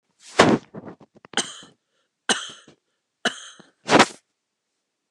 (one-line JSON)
{"cough_length": "5.1 s", "cough_amplitude": 29204, "cough_signal_mean_std_ratio": 0.27, "survey_phase": "alpha (2021-03-01 to 2021-08-12)", "age": "65+", "gender": "Female", "wearing_mask": "No", "symptom_none": true, "smoker_status": "Never smoked", "respiratory_condition_asthma": false, "respiratory_condition_other": false, "recruitment_source": "REACT", "submission_delay": "3 days", "covid_test_result": "Negative", "covid_test_method": "RT-qPCR"}